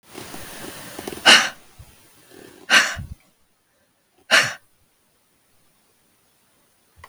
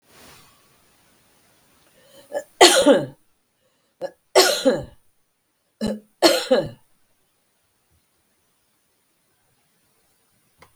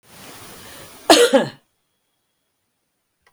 {"exhalation_length": "7.1 s", "exhalation_amplitude": 32768, "exhalation_signal_mean_std_ratio": 0.27, "three_cough_length": "10.8 s", "three_cough_amplitude": 32768, "three_cough_signal_mean_std_ratio": 0.27, "cough_length": "3.3 s", "cough_amplitude": 32768, "cough_signal_mean_std_ratio": 0.28, "survey_phase": "beta (2021-08-13 to 2022-03-07)", "age": "65+", "gender": "Female", "wearing_mask": "No", "symptom_none": true, "smoker_status": "Ex-smoker", "respiratory_condition_asthma": false, "respiratory_condition_other": false, "recruitment_source": "REACT", "submission_delay": "2 days", "covid_test_result": "Negative", "covid_test_method": "RT-qPCR", "influenza_a_test_result": "Negative", "influenza_b_test_result": "Negative"}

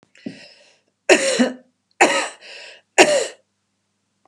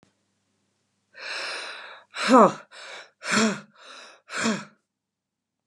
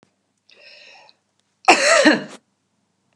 {"three_cough_length": "4.3 s", "three_cough_amplitude": 32768, "three_cough_signal_mean_std_ratio": 0.36, "exhalation_length": "5.7 s", "exhalation_amplitude": 23207, "exhalation_signal_mean_std_ratio": 0.33, "cough_length": "3.2 s", "cough_amplitude": 32768, "cough_signal_mean_std_ratio": 0.33, "survey_phase": "beta (2021-08-13 to 2022-03-07)", "age": "45-64", "gender": "Female", "wearing_mask": "No", "symptom_none": true, "smoker_status": "Ex-smoker", "respiratory_condition_asthma": false, "respiratory_condition_other": false, "recruitment_source": "REACT", "submission_delay": "1 day", "covid_test_result": "Negative", "covid_test_method": "RT-qPCR"}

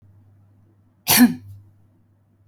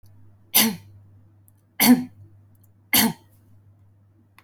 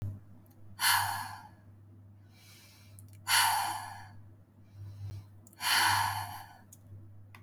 {"cough_length": "2.5 s", "cough_amplitude": 24470, "cough_signal_mean_std_ratio": 0.27, "three_cough_length": "4.4 s", "three_cough_amplitude": 26405, "three_cough_signal_mean_std_ratio": 0.32, "exhalation_length": "7.4 s", "exhalation_amplitude": 7165, "exhalation_signal_mean_std_ratio": 0.5, "survey_phase": "alpha (2021-03-01 to 2021-08-12)", "age": "18-44", "gender": "Female", "wearing_mask": "No", "symptom_none": true, "smoker_status": "Never smoked", "respiratory_condition_asthma": false, "respiratory_condition_other": false, "recruitment_source": "REACT", "submission_delay": "2 days", "covid_test_result": "Negative", "covid_test_method": "RT-qPCR"}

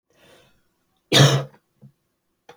{"cough_length": "2.6 s", "cough_amplitude": 29064, "cough_signal_mean_std_ratio": 0.28, "survey_phase": "alpha (2021-03-01 to 2021-08-12)", "age": "18-44", "gender": "Male", "wearing_mask": "No", "symptom_cough_any": true, "symptom_onset": "4 days", "smoker_status": "Never smoked", "respiratory_condition_asthma": false, "respiratory_condition_other": false, "recruitment_source": "Test and Trace", "submission_delay": "2 days", "covid_test_result": "Positive", "covid_test_method": "RT-qPCR", "covid_ct_value": 16.7, "covid_ct_gene": "ORF1ab gene", "covid_ct_mean": 16.9, "covid_viral_load": "2800000 copies/ml", "covid_viral_load_category": "High viral load (>1M copies/ml)"}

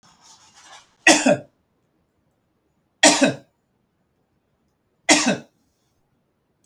{"three_cough_length": "6.7 s", "three_cough_amplitude": 32768, "three_cough_signal_mean_std_ratio": 0.27, "survey_phase": "beta (2021-08-13 to 2022-03-07)", "age": "65+", "gender": "Male", "wearing_mask": "No", "symptom_none": true, "smoker_status": "Never smoked", "respiratory_condition_asthma": false, "respiratory_condition_other": false, "recruitment_source": "REACT", "submission_delay": "5 days", "covid_test_result": "Negative", "covid_test_method": "RT-qPCR", "influenza_a_test_result": "Negative", "influenza_b_test_result": "Negative"}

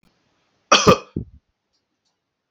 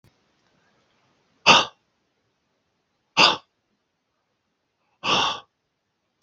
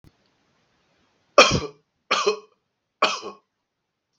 {"cough_length": "2.5 s", "cough_amplitude": 32768, "cough_signal_mean_std_ratio": 0.24, "exhalation_length": "6.2 s", "exhalation_amplitude": 32768, "exhalation_signal_mean_std_ratio": 0.24, "three_cough_length": "4.2 s", "three_cough_amplitude": 32767, "three_cough_signal_mean_std_ratio": 0.27, "survey_phase": "beta (2021-08-13 to 2022-03-07)", "age": "18-44", "gender": "Male", "wearing_mask": "No", "symptom_none": true, "smoker_status": "Never smoked", "respiratory_condition_asthma": false, "respiratory_condition_other": false, "recruitment_source": "REACT", "submission_delay": "1 day", "covid_test_result": "Negative", "covid_test_method": "RT-qPCR"}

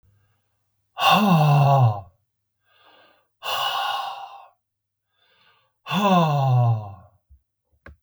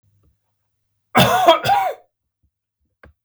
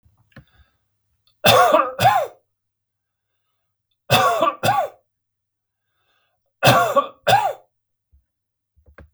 {"exhalation_length": "8.0 s", "exhalation_amplitude": 19399, "exhalation_signal_mean_std_ratio": 0.5, "cough_length": "3.2 s", "cough_amplitude": 32768, "cough_signal_mean_std_ratio": 0.38, "three_cough_length": "9.1 s", "three_cough_amplitude": 32768, "three_cough_signal_mean_std_ratio": 0.38, "survey_phase": "beta (2021-08-13 to 2022-03-07)", "age": "65+", "gender": "Male", "wearing_mask": "No", "symptom_none": true, "smoker_status": "Ex-smoker", "respiratory_condition_asthma": false, "respiratory_condition_other": false, "recruitment_source": "REACT", "submission_delay": "2 days", "covid_test_result": "Negative", "covid_test_method": "RT-qPCR", "influenza_a_test_result": "Negative", "influenza_b_test_result": "Negative"}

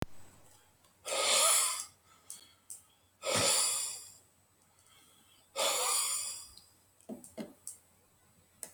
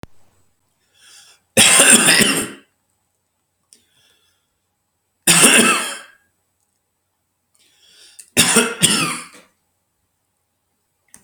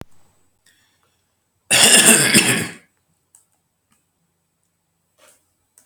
{"exhalation_length": "8.7 s", "exhalation_amplitude": 6405, "exhalation_signal_mean_std_ratio": 0.47, "three_cough_length": "11.2 s", "three_cough_amplitude": 32768, "three_cough_signal_mean_std_ratio": 0.35, "cough_length": "5.9 s", "cough_amplitude": 32768, "cough_signal_mean_std_ratio": 0.32, "survey_phase": "alpha (2021-03-01 to 2021-08-12)", "age": "65+", "gender": "Male", "wearing_mask": "No", "symptom_none": true, "smoker_status": "Ex-smoker", "respiratory_condition_asthma": false, "respiratory_condition_other": false, "recruitment_source": "REACT", "submission_delay": "2 days", "covid_test_result": "Negative", "covid_test_method": "RT-qPCR"}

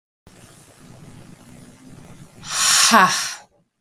{"exhalation_length": "3.8 s", "exhalation_amplitude": 32768, "exhalation_signal_mean_std_ratio": 0.39, "survey_phase": "beta (2021-08-13 to 2022-03-07)", "age": "45-64", "gender": "Male", "wearing_mask": "No", "symptom_cough_any": true, "symptom_headache": true, "symptom_onset": "4 days", "smoker_status": "Ex-smoker", "respiratory_condition_asthma": false, "respiratory_condition_other": false, "recruitment_source": "Test and Trace", "submission_delay": "3 days", "covid_test_result": "Positive", "covid_test_method": "RT-qPCR"}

